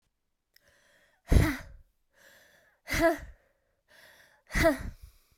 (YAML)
exhalation_length: 5.4 s
exhalation_amplitude: 13989
exhalation_signal_mean_std_ratio: 0.32
survey_phase: beta (2021-08-13 to 2022-03-07)
age: 18-44
gender: Female
wearing_mask: 'No'
symptom_cough_any: true
symptom_runny_or_blocked_nose: true
symptom_abdominal_pain: true
symptom_fatigue: true
symptom_fever_high_temperature: true
symptom_onset: 3 days
smoker_status: Never smoked
respiratory_condition_asthma: false
respiratory_condition_other: false
recruitment_source: Test and Trace
submission_delay: 2 days
covid_test_result: Positive
covid_test_method: RT-qPCR
covid_ct_value: 16.1
covid_ct_gene: ORF1ab gene
covid_ct_mean: 16.4
covid_viral_load: 4100000 copies/ml
covid_viral_load_category: High viral load (>1M copies/ml)